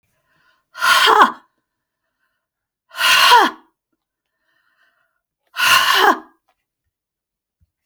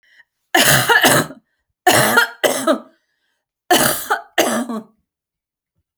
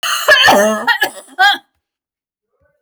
{
  "exhalation_length": "7.9 s",
  "exhalation_amplitude": 32768,
  "exhalation_signal_mean_std_ratio": 0.37,
  "three_cough_length": "6.0 s",
  "three_cough_amplitude": 32768,
  "three_cough_signal_mean_std_ratio": 0.49,
  "cough_length": "2.8 s",
  "cough_amplitude": 32599,
  "cough_signal_mean_std_ratio": 0.55,
  "survey_phase": "beta (2021-08-13 to 2022-03-07)",
  "age": "45-64",
  "gender": "Female",
  "wearing_mask": "No",
  "symptom_none": true,
  "smoker_status": "Never smoked",
  "respiratory_condition_asthma": false,
  "respiratory_condition_other": false,
  "recruitment_source": "REACT",
  "submission_delay": "5 days",
  "covid_test_result": "Negative",
  "covid_test_method": "RT-qPCR"
}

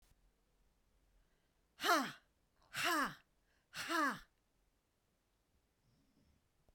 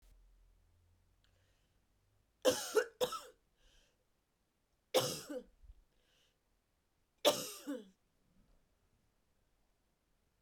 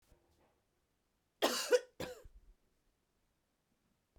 {
  "exhalation_length": "6.7 s",
  "exhalation_amplitude": 2999,
  "exhalation_signal_mean_std_ratio": 0.32,
  "three_cough_length": "10.4 s",
  "three_cough_amplitude": 6129,
  "three_cough_signal_mean_std_ratio": 0.25,
  "cough_length": "4.2 s",
  "cough_amplitude": 4231,
  "cough_signal_mean_std_ratio": 0.24,
  "survey_phase": "beta (2021-08-13 to 2022-03-07)",
  "age": "45-64",
  "gender": "Female",
  "wearing_mask": "No",
  "symptom_cough_any": true,
  "symptom_runny_or_blocked_nose": true,
  "symptom_change_to_sense_of_smell_or_taste": true,
  "smoker_status": "Ex-smoker",
  "respiratory_condition_asthma": false,
  "respiratory_condition_other": false,
  "recruitment_source": "Test and Trace",
  "submission_delay": "1 day",
  "covid_test_result": "Positive",
  "covid_test_method": "RT-qPCR",
  "covid_ct_value": 20.9,
  "covid_ct_gene": "N gene"
}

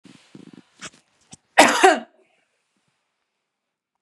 {
  "exhalation_length": "4.0 s",
  "exhalation_amplitude": 32767,
  "exhalation_signal_mean_std_ratio": 0.24,
  "survey_phase": "beta (2021-08-13 to 2022-03-07)",
  "age": "45-64",
  "gender": "Female",
  "wearing_mask": "No",
  "symptom_none": true,
  "smoker_status": "Never smoked",
  "respiratory_condition_asthma": false,
  "respiratory_condition_other": false,
  "recruitment_source": "REACT",
  "submission_delay": "1 day",
  "covid_test_result": "Negative",
  "covid_test_method": "RT-qPCR",
  "influenza_a_test_result": "Unknown/Void",
  "influenza_b_test_result": "Unknown/Void"
}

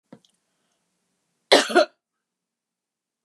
{
  "cough_length": "3.2 s",
  "cough_amplitude": 30329,
  "cough_signal_mean_std_ratio": 0.22,
  "survey_phase": "beta (2021-08-13 to 2022-03-07)",
  "age": "65+",
  "gender": "Female",
  "wearing_mask": "No",
  "symptom_none": true,
  "symptom_onset": "13 days",
  "smoker_status": "Never smoked",
  "respiratory_condition_asthma": false,
  "respiratory_condition_other": true,
  "recruitment_source": "REACT",
  "submission_delay": "0 days",
  "covid_test_result": "Negative",
  "covid_test_method": "RT-qPCR",
  "influenza_a_test_result": "Negative",
  "influenza_b_test_result": "Negative"
}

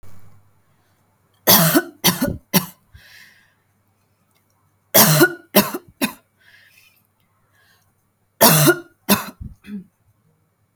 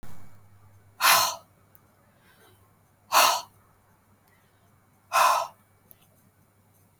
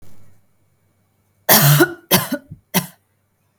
{
  "three_cough_length": "10.8 s",
  "three_cough_amplitude": 32768,
  "three_cough_signal_mean_std_ratio": 0.33,
  "exhalation_length": "7.0 s",
  "exhalation_amplitude": 18519,
  "exhalation_signal_mean_std_ratio": 0.33,
  "cough_length": "3.6 s",
  "cough_amplitude": 32768,
  "cough_signal_mean_std_ratio": 0.37,
  "survey_phase": "beta (2021-08-13 to 2022-03-07)",
  "age": "18-44",
  "gender": "Female",
  "wearing_mask": "No",
  "symptom_none": true,
  "symptom_onset": "8 days",
  "smoker_status": "Ex-smoker",
  "respiratory_condition_asthma": false,
  "respiratory_condition_other": false,
  "recruitment_source": "REACT",
  "submission_delay": "1 day",
  "covid_test_result": "Negative",
  "covid_test_method": "RT-qPCR",
  "influenza_a_test_result": "Negative",
  "influenza_b_test_result": "Negative"
}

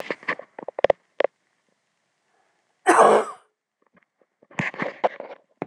{
  "cough_length": "5.7 s",
  "cough_amplitude": 26027,
  "cough_signal_mean_std_ratio": 0.28,
  "survey_phase": "beta (2021-08-13 to 2022-03-07)",
  "age": "45-64",
  "gender": "Female",
  "wearing_mask": "No",
  "symptom_cough_any": true,
  "symptom_runny_or_blocked_nose": true,
  "symptom_shortness_of_breath": true,
  "symptom_fatigue": true,
  "symptom_change_to_sense_of_smell_or_taste": true,
  "symptom_onset": "12 days",
  "smoker_status": "Ex-smoker",
  "respiratory_condition_asthma": false,
  "respiratory_condition_other": false,
  "recruitment_source": "REACT",
  "submission_delay": "0 days",
  "covid_test_result": "Negative",
  "covid_test_method": "RT-qPCR"
}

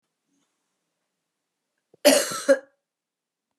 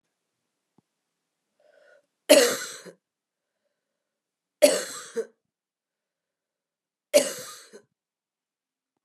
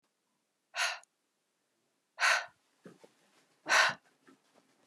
{
  "cough_length": "3.6 s",
  "cough_amplitude": 23527,
  "cough_signal_mean_std_ratio": 0.24,
  "three_cough_length": "9.0 s",
  "three_cough_amplitude": 26782,
  "three_cough_signal_mean_std_ratio": 0.21,
  "exhalation_length": "4.9 s",
  "exhalation_amplitude": 7881,
  "exhalation_signal_mean_std_ratio": 0.29,
  "survey_phase": "beta (2021-08-13 to 2022-03-07)",
  "age": "45-64",
  "gender": "Female",
  "wearing_mask": "No",
  "symptom_cough_any": true,
  "symptom_new_continuous_cough": true,
  "symptom_runny_or_blocked_nose": true,
  "symptom_fatigue": true,
  "symptom_onset": "3 days",
  "smoker_status": "Ex-smoker",
  "respiratory_condition_asthma": false,
  "respiratory_condition_other": false,
  "recruitment_source": "Test and Trace",
  "submission_delay": "2 days",
  "covid_test_result": "Positive",
  "covid_test_method": "LAMP"
}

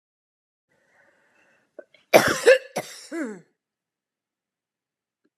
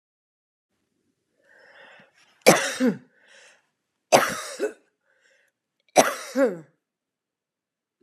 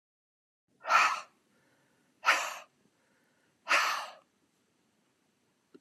{
  "cough_length": "5.4 s",
  "cough_amplitude": 29707,
  "cough_signal_mean_std_ratio": 0.23,
  "three_cough_length": "8.0 s",
  "three_cough_amplitude": 30958,
  "three_cough_signal_mean_std_ratio": 0.27,
  "exhalation_length": "5.8 s",
  "exhalation_amplitude": 8011,
  "exhalation_signal_mean_std_ratio": 0.31,
  "survey_phase": "alpha (2021-03-01 to 2021-08-12)",
  "age": "45-64",
  "gender": "Female",
  "wearing_mask": "No",
  "symptom_none": true,
  "symptom_onset": "9 days",
  "smoker_status": "Never smoked",
  "respiratory_condition_asthma": false,
  "respiratory_condition_other": false,
  "recruitment_source": "REACT",
  "submission_delay": "1 day",
  "covid_test_result": "Negative",
  "covid_test_method": "RT-qPCR"
}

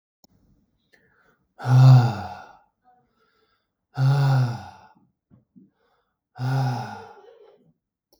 {
  "exhalation_length": "8.2 s",
  "exhalation_amplitude": 21542,
  "exhalation_signal_mean_std_ratio": 0.35,
  "survey_phase": "beta (2021-08-13 to 2022-03-07)",
  "age": "45-64",
  "gender": "Male",
  "wearing_mask": "No",
  "symptom_none": true,
  "smoker_status": "Never smoked",
  "respiratory_condition_asthma": false,
  "respiratory_condition_other": false,
  "recruitment_source": "REACT",
  "submission_delay": "4 days",
  "covid_test_result": "Negative",
  "covid_test_method": "RT-qPCR",
  "influenza_a_test_result": "Negative",
  "influenza_b_test_result": "Negative"
}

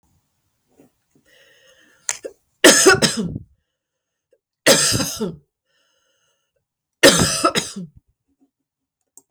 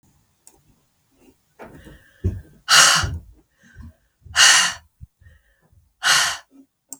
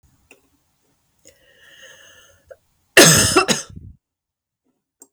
{
  "three_cough_length": "9.3 s",
  "three_cough_amplitude": 32768,
  "three_cough_signal_mean_std_ratio": 0.32,
  "exhalation_length": "7.0 s",
  "exhalation_amplitude": 32768,
  "exhalation_signal_mean_std_ratio": 0.34,
  "cough_length": "5.1 s",
  "cough_amplitude": 32768,
  "cough_signal_mean_std_ratio": 0.27,
  "survey_phase": "beta (2021-08-13 to 2022-03-07)",
  "age": "45-64",
  "gender": "Female",
  "wearing_mask": "No",
  "symptom_cough_any": true,
  "symptom_runny_or_blocked_nose": true,
  "symptom_fatigue": true,
  "smoker_status": "Never smoked",
  "respiratory_condition_asthma": false,
  "respiratory_condition_other": false,
  "recruitment_source": "Test and Trace",
  "submission_delay": "2 days",
  "covid_test_result": "Positive",
  "covid_test_method": "LFT"
}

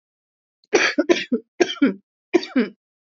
{
  "three_cough_length": "3.1 s",
  "three_cough_amplitude": 27265,
  "three_cough_signal_mean_std_ratio": 0.41,
  "survey_phase": "beta (2021-08-13 to 2022-03-07)",
  "age": "18-44",
  "gender": "Female",
  "wearing_mask": "No",
  "symptom_cough_any": true,
  "symptom_new_continuous_cough": true,
  "symptom_runny_or_blocked_nose": true,
  "symptom_fatigue": true,
  "symptom_change_to_sense_of_smell_or_taste": true,
  "symptom_other": true,
  "symptom_onset": "8 days",
  "smoker_status": "Never smoked",
  "respiratory_condition_asthma": false,
  "respiratory_condition_other": false,
  "recruitment_source": "Test and Trace",
  "submission_delay": "4 days",
  "covid_test_result": "Negative",
  "covid_test_method": "RT-qPCR"
}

